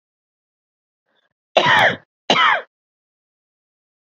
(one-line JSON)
{"cough_length": "4.1 s", "cough_amplitude": 30146, "cough_signal_mean_std_ratio": 0.33, "survey_phase": "beta (2021-08-13 to 2022-03-07)", "age": "45-64", "gender": "Female", "wearing_mask": "No", "symptom_cough_any": true, "symptom_runny_or_blocked_nose": true, "symptom_shortness_of_breath": true, "symptom_fatigue": true, "symptom_headache": true, "symptom_onset": "3 days", "smoker_status": "Ex-smoker", "respiratory_condition_asthma": false, "respiratory_condition_other": false, "recruitment_source": "Test and Trace", "submission_delay": "1 day", "covid_test_result": "Positive", "covid_test_method": "ePCR"}